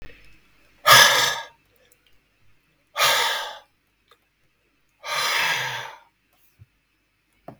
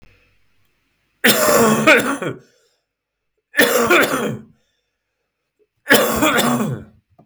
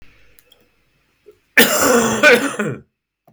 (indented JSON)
{
  "exhalation_length": "7.6 s",
  "exhalation_amplitude": 32768,
  "exhalation_signal_mean_std_ratio": 0.35,
  "three_cough_length": "7.3 s",
  "three_cough_amplitude": 32766,
  "three_cough_signal_mean_std_ratio": 0.5,
  "cough_length": "3.3 s",
  "cough_amplitude": 32768,
  "cough_signal_mean_std_ratio": 0.45,
  "survey_phase": "beta (2021-08-13 to 2022-03-07)",
  "age": "65+",
  "gender": "Male",
  "wearing_mask": "No",
  "symptom_cough_any": true,
  "symptom_runny_or_blocked_nose": true,
  "smoker_status": "Never smoked",
  "respiratory_condition_asthma": false,
  "respiratory_condition_other": false,
  "recruitment_source": "Test and Trace",
  "submission_delay": "1 day",
  "covid_test_result": "Positive",
  "covid_test_method": "RT-qPCR"
}